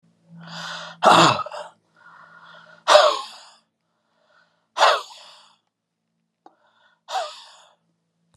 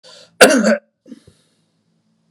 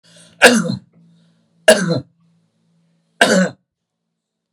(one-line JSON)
{"exhalation_length": "8.4 s", "exhalation_amplitude": 32617, "exhalation_signal_mean_std_ratio": 0.3, "cough_length": "2.3 s", "cough_amplitude": 32768, "cough_signal_mean_std_ratio": 0.32, "three_cough_length": "4.5 s", "three_cough_amplitude": 32768, "three_cough_signal_mean_std_ratio": 0.33, "survey_phase": "beta (2021-08-13 to 2022-03-07)", "age": "45-64", "gender": "Male", "wearing_mask": "No", "symptom_none": true, "smoker_status": "Never smoked", "respiratory_condition_asthma": false, "respiratory_condition_other": false, "recruitment_source": "REACT", "submission_delay": "2 days", "covid_test_result": "Negative", "covid_test_method": "RT-qPCR"}